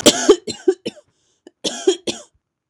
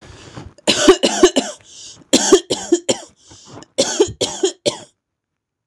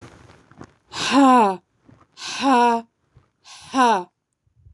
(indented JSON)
{
  "cough_length": "2.7 s",
  "cough_amplitude": 26028,
  "cough_signal_mean_std_ratio": 0.35,
  "three_cough_length": "5.7 s",
  "three_cough_amplitude": 26028,
  "three_cough_signal_mean_std_ratio": 0.42,
  "exhalation_length": "4.7 s",
  "exhalation_amplitude": 21937,
  "exhalation_signal_mean_std_ratio": 0.44,
  "survey_phase": "beta (2021-08-13 to 2022-03-07)",
  "age": "45-64",
  "gender": "Female",
  "wearing_mask": "No",
  "symptom_none": true,
  "smoker_status": "Never smoked",
  "respiratory_condition_asthma": false,
  "respiratory_condition_other": false,
  "recruitment_source": "REACT",
  "submission_delay": "2 days",
  "covid_test_result": "Negative",
  "covid_test_method": "RT-qPCR",
  "influenza_a_test_result": "Negative",
  "influenza_b_test_result": "Negative"
}